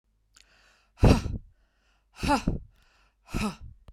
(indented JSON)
{
  "exhalation_length": "3.9 s",
  "exhalation_amplitude": 21777,
  "exhalation_signal_mean_std_ratio": 0.33,
  "survey_phase": "beta (2021-08-13 to 2022-03-07)",
  "age": "65+",
  "gender": "Female",
  "wearing_mask": "No",
  "symptom_none": true,
  "smoker_status": "Ex-smoker",
  "respiratory_condition_asthma": false,
  "respiratory_condition_other": false,
  "recruitment_source": "REACT",
  "submission_delay": "2 days",
  "covid_test_result": "Negative",
  "covid_test_method": "RT-qPCR",
  "influenza_a_test_result": "Negative",
  "influenza_b_test_result": "Negative"
}